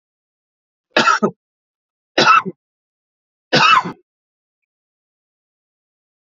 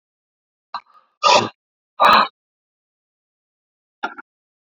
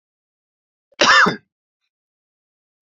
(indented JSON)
{
  "three_cough_length": "6.2 s",
  "three_cough_amplitude": 32767,
  "three_cough_signal_mean_std_ratio": 0.3,
  "exhalation_length": "4.7 s",
  "exhalation_amplitude": 32605,
  "exhalation_signal_mean_std_ratio": 0.27,
  "cough_length": "2.8 s",
  "cough_amplitude": 30426,
  "cough_signal_mean_std_ratio": 0.28,
  "survey_phase": "alpha (2021-03-01 to 2021-08-12)",
  "age": "65+",
  "gender": "Male",
  "wearing_mask": "No",
  "symptom_cough_any": true,
  "symptom_shortness_of_breath": true,
  "symptom_fatigue": true,
  "symptom_headache": true,
  "symptom_onset": "4 days",
  "smoker_status": "Never smoked",
  "respiratory_condition_asthma": true,
  "respiratory_condition_other": false,
  "recruitment_source": "Test and Trace",
  "submission_delay": "3 days",
  "covid_test_result": "Positive",
  "covid_test_method": "RT-qPCR",
  "covid_ct_value": 16.2,
  "covid_ct_gene": "N gene",
  "covid_ct_mean": 16.4,
  "covid_viral_load": "4200000 copies/ml",
  "covid_viral_load_category": "High viral load (>1M copies/ml)"
}